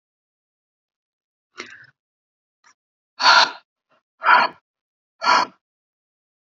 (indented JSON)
{
  "exhalation_length": "6.5 s",
  "exhalation_amplitude": 29740,
  "exhalation_signal_mean_std_ratio": 0.27,
  "survey_phase": "beta (2021-08-13 to 2022-03-07)",
  "age": "45-64",
  "gender": "Female",
  "wearing_mask": "No",
  "symptom_fatigue": true,
  "smoker_status": "Never smoked",
  "respiratory_condition_asthma": true,
  "respiratory_condition_other": false,
  "recruitment_source": "REACT",
  "submission_delay": "4 days",
  "covid_test_result": "Negative",
  "covid_test_method": "RT-qPCR",
  "influenza_a_test_result": "Negative",
  "influenza_b_test_result": "Negative"
}